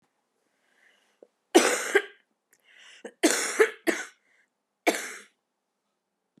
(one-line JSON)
{"three_cough_length": "6.4 s", "three_cough_amplitude": 21310, "three_cough_signal_mean_std_ratio": 0.3, "survey_phase": "beta (2021-08-13 to 2022-03-07)", "age": "45-64", "gender": "Female", "wearing_mask": "Yes", "symptom_cough_any": true, "symptom_runny_or_blocked_nose": true, "symptom_fever_high_temperature": true, "symptom_headache": true, "smoker_status": "Ex-smoker", "respiratory_condition_asthma": false, "respiratory_condition_other": false, "recruitment_source": "Test and Trace", "submission_delay": "1 day", "covid_test_result": "Positive", "covid_test_method": "RT-qPCR", "covid_ct_value": 23.2, "covid_ct_gene": "ORF1ab gene", "covid_ct_mean": 23.6, "covid_viral_load": "17000 copies/ml", "covid_viral_load_category": "Low viral load (10K-1M copies/ml)"}